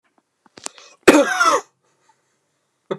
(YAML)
cough_length: 3.0 s
cough_amplitude: 29204
cough_signal_mean_std_ratio: 0.32
survey_phase: alpha (2021-03-01 to 2021-08-12)
age: 45-64
gender: Male
wearing_mask: 'No'
symptom_none: true
symptom_onset: 6 days
smoker_status: Ex-smoker
respiratory_condition_asthma: false
respiratory_condition_other: false
recruitment_source: REACT
submission_delay: 3 days
covid_test_result: Negative
covid_test_method: RT-qPCR